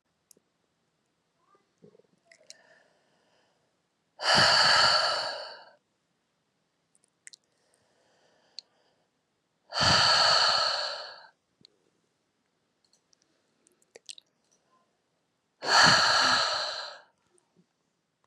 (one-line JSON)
{"exhalation_length": "18.3 s", "exhalation_amplitude": 15634, "exhalation_signal_mean_std_ratio": 0.35, "survey_phase": "beta (2021-08-13 to 2022-03-07)", "age": "18-44", "gender": "Female", "wearing_mask": "No", "symptom_runny_or_blocked_nose": true, "symptom_sore_throat": true, "smoker_status": "Never smoked", "respiratory_condition_asthma": false, "respiratory_condition_other": false, "recruitment_source": "Test and Trace", "submission_delay": "1 day", "covid_test_result": "Negative", "covid_test_method": "ePCR"}